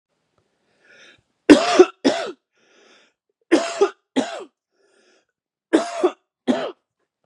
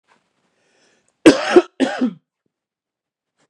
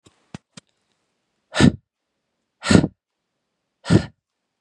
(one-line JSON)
{"three_cough_length": "7.3 s", "three_cough_amplitude": 32768, "three_cough_signal_mean_std_ratio": 0.3, "cough_length": "3.5 s", "cough_amplitude": 32768, "cough_signal_mean_std_ratio": 0.26, "exhalation_length": "4.6 s", "exhalation_amplitude": 32768, "exhalation_signal_mean_std_ratio": 0.24, "survey_phase": "beta (2021-08-13 to 2022-03-07)", "age": "18-44", "gender": "Male", "wearing_mask": "No", "symptom_none": true, "smoker_status": "Never smoked", "respiratory_condition_asthma": false, "respiratory_condition_other": false, "recruitment_source": "REACT", "submission_delay": "0 days", "covid_test_result": "Negative", "covid_test_method": "RT-qPCR", "influenza_a_test_result": "Negative", "influenza_b_test_result": "Negative"}